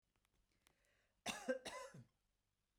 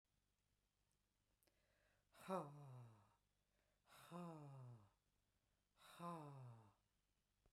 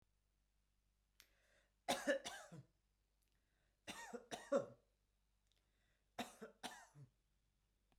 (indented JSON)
{
  "cough_length": "2.8 s",
  "cough_amplitude": 1269,
  "cough_signal_mean_std_ratio": 0.33,
  "exhalation_length": "7.5 s",
  "exhalation_amplitude": 672,
  "exhalation_signal_mean_std_ratio": 0.42,
  "three_cough_length": "8.0 s",
  "three_cough_amplitude": 1665,
  "three_cough_signal_mean_std_ratio": 0.28,
  "survey_phase": "beta (2021-08-13 to 2022-03-07)",
  "age": "45-64",
  "gender": "Female",
  "wearing_mask": "No",
  "symptom_none": true,
  "smoker_status": "Never smoked",
  "respiratory_condition_asthma": false,
  "respiratory_condition_other": false,
  "recruitment_source": "REACT",
  "submission_delay": "3 days",
  "covid_test_result": "Negative",
  "covid_test_method": "RT-qPCR"
}